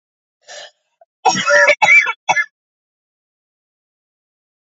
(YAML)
three_cough_length: 4.8 s
three_cough_amplitude: 28050
three_cough_signal_mean_std_ratio: 0.35
survey_phase: beta (2021-08-13 to 2022-03-07)
age: 18-44
gender: Female
wearing_mask: 'No'
symptom_cough_any: true
symptom_runny_or_blocked_nose: true
symptom_shortness_of_breath: true
symptom_abdominal_pain: true
symptom_fatigue: true
symptom_fever_high_temperature: true
symptom_headache: true
symptom_change_to_sense_of_smell_or_taste: true
symptom_loss_of_taste: true
symptom_onset: 4 days
smoker_status: Never smoked
respiratory_condition_asthma: false
respiratory_condition_other: false
recruitment_source: Test and Trace
submission_delay: 2 days
covid_test_result: Positive
covid_test_method: RT-qPCR
covid_ct_value: 21.5
covid_ct_gene: ORF1ab gene
covid_ct_mean: 21.7
covid_viral_load: 79000 copies/ml
covid_viral_load_category: Low viral load (10K-1M copies/ml)